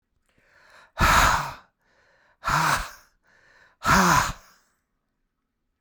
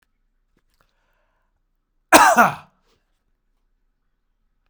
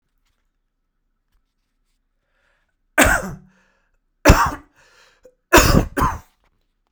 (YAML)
exhalation_length: 5.8 s
exhalation_amplitude: 22195
exhalation_signal_mean_std_ratio: 0.4
cough_length: 4.7 s
cough_amplitude: 32768
cough_signal_mean_std_ratio: 0.22
three_cough_length: 6.9 s
three_cough_amplitude: 32768
three_cough_signal_mean_std_ratio: 0.29
survey_phase: beta (2021-08-13 to 2022-03-07)
age: 45-64
gender: Male
wearing_mask: 'No'
symptom_runny_or_blocked_nose: true
symptom_sore_throat: true
symptom_onset: 12 days
smoker_status: Never smoked
respiratory_condition_asthma: true
respiratory_condition_other: false
recruitment_source: REACT
submission_delay: 2 days
covid_test_result: Negative
covid_test_method: RT-qPCR